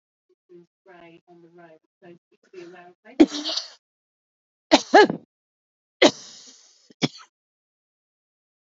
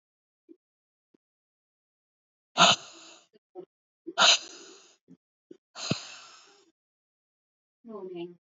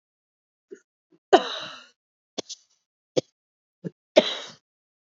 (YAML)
three_cough_length: 8.7 s
three_cough_amplitude: 30333
three_cough_signal_mean_std_ratio: 0.2
exhalation_length: 8.5 s
exhalation_amplitude: 18516
exhalation_signal_mean_std_ratio: 0.22
cough_length: 5.1 s
cough_amplitude: 29729
cough_signal_mean_std_ratio: 0.19
survey_phase: alpha (2021-03-01 to 2021-08-12)
age: 45-64
gender: Female
wearing_mask: 'No'
symptom_cough_any: true
symptom_new_continuous_cough: true
symptom_shortness_of_breath: true
symptom_abdominal_pain: true
symptom_diarrhoea: true
symptom_fatigue: true
symptom_fever_high_temperature: true
symptom_headache: true
symptom_change_to_sense_of_smell_or_taste: true
symptom_loss_of_taste: true
symptom_onset: 5 days
smoker_status: Ex-smoker
respiratory_condition_asthma: false
respiratory_condition_other: false
recruitment_source: Test and Trace
submission_delay: 2 days
covid_test_result: Positive
covid_test_method: RT-qPCR